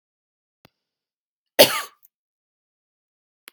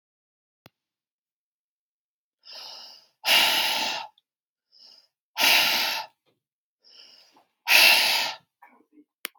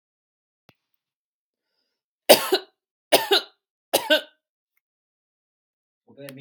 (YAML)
cough_length: 3.5 s
cough_amplitude: 32768
cough_signal_mean_std_ratio: 0.15
exhalation_length: 9.4 s
exhalation_amplitude: 24397
exhalation_signal_mean_std_ratio: 0.37
three_cough_length: 6.4 s
three_cough_amplitude: 32768
three_cough_signal_mean_std_ratio: 0.22
survey_phase: beta (2021-08-13 to 2022-03-07)
age: 45-64
gender: Female
wearing_mask: 'No'
symptom_none: true
smoker_status: Never smoked
respiratory_condition_asthma: false
respiratory_condition_other: false
recruitment_source: REACT
submission_delay: 3 days
covid_test_result: Negative
covid_test_method: RT-qPCR
influenza_a_test_result: Negative
influenza_b_test_result: Negative